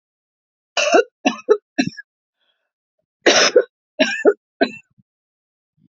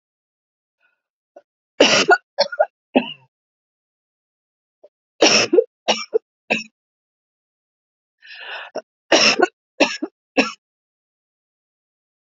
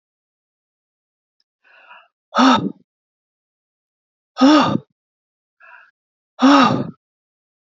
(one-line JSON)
{"cough_length": "6.0 s", "cough_amplitude": 30694, "cough_signal_mean_std_ratio": 0.34, "three_cough_length": "12.4 s", "three_cough_amplitude": 32361, "three_cough_signal_mean_std_ratio": 0.29, "exhalation_length": "7.8 s", "exhalation_amplitude": 30128, "exhalation_signal_mean_std_ratio": 0.3, "survey_phase": "alpha (2021-03-01 to 2021-08-12)", "age": "45-64", "gender": "Female", "wearing_mask": "No", "symptom_none": true, "smoker_status": "Never smoked", "respiratory_condition_asthma": false, "respiratory_condition_other": false, "recruitment_source": "REACT", "submission_delay": "2 days", "covid_test_result": "Negative", "covid_test_method": "RT-qPCR"}